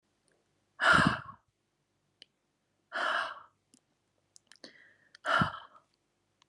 {"exhalation_length": "6.5 s", "exhalation_amplitude": 9211, "exhalation_signal_mean_std_ratio": 0.3, "survey_phase": "alpha (2021-03-01 to 2021-08-12)", "age": "18-44", "gender": "Female", "wearing_mask": "No", "symptom_new_continuous_cough": true, "symptom_fatigue": true, "symptom_fever_high_temperature": true, "symptom_headache": true, "symptom_change_to_sense_of_smell_or_taste": true, "symptom_loss_of_taste": true, "symptom_onset": "3 days", "smoker_status": "Never smoked", "respiratory_condition_asthma": false, "respiratory_condition_other": false, "recruitment_source": "Test and Trace", "submission_delay": "1 day", "covid_test_result": "Positive", "covid_test_method": "RT-qPCR", "covid_ct_value": 16.3, "covid_ct_gene": "ORF1ab gene", "covid_ct_mean": 16.6, "covid_viral_load": "3600000 copies/ml", "covid_viral_load_category": "High viral load (>1M copies/ml)"}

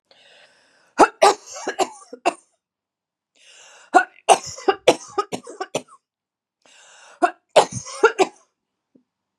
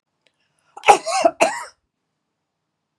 {"three_cough_length": "9.4 s", "three_cough_amplitude": 32768, "three_cough_signal_mean_std_ratio": 0.28, "cough_length": "3.0 s", "cough_amplitude": 32768, "cough_signal_mean_std_ratio": 0.28, "survey_phase": "beta (2021-08-13 to 2022-03-07)", "age": "65+", "gender": "Female", "wearing_mask": "No", "symptom_none": true, "smoker_status": "Never smoked", "respiratory_condition_asthma": true, "respiratory_condition_other": false, "recruitment_source": "REACT", "submission_delay": "0 days", "covid_test_result": "Negative", "covid_test_method": "RT-qPCR"}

